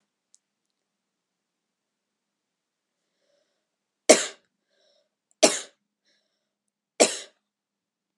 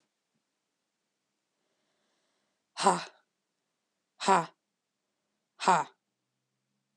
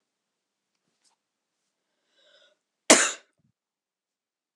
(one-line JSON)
{"three_cough_length": "8.2 s", "three_cough_amplitude": 31676, "three_cough_signal_mean_std_ratio": 0.15, "exhalation_length": "7.0 s", "exhalation_amplitude": 12078, "exhalation_signal_mean_std_ratio": 0.21, "cough_length": "4.6 s", "cough_amplitude": 32158, "cough_signal_mean_std_ratio": 0.15, "survey_phase": "alpha (2021-03-01 to 2021-08-12)", "age": "18-44", "gender": "Female", "wearing_mask": "No", "symptom_cough_any": true, "symptom_fatigue": true, "symptom_headache": true, "symptom_change_to_sense_of_smell_or_taste": true, "symptom_loss_of_taste": true, "symptom_onset": "3 days", "smoker_status": "Never smoked", "respiratory_condition_asthma": false, "respiratory_condition_other": false, "recruitment_source": "Test and Trace", "submission_delay": "2 days", "covid_test_result": "Positive", "covid_test_method": "RT-qPCR"}